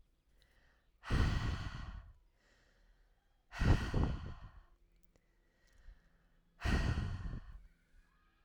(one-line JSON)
{"exhalation_length": "8.4 s", "exhalation_amplitude": 4424, "exhalation_signal_mean_std_ratio": 0.42, "survey_phase": "alpha (2021-03-01 to 2021-08-12)", "age": "18-44", "gender": "Female", "wearing_mask": "No", "symptom_none": true, "symptom_onset": "2 days", "smoker_status": "Ex-smoker", "respiratory_condition_asthma": false, "respiratory_condition_other": false, "recruitment_source": "REACT", "submission_delay": "4 days", "covid_test_result": "Negative", "covid_test_method": "RT-qPCR"}